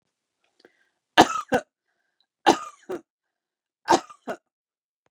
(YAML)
three_cough_length: 5.1 s
three_cough_amplitude: 30700
three_cough_signal_mean_std_ratio: 0.22
survey_phase: beta (2021-08-13 to 2022-03-07)
age: 45-64
gender: Female
wearing_mask: 'No'
symptom_fatigue: true
smoker_status: Ex-smoker
respiratory_condition_asthma: false
respiratory_condition_other: true
recruitment_source: REACT
submission_delay: 2 days
covid_test_result: Negative
covid_test_method: RT-qPCR
influenza_a_test_result: Unknown/Void
influenza_b_test_result: Unknown/Void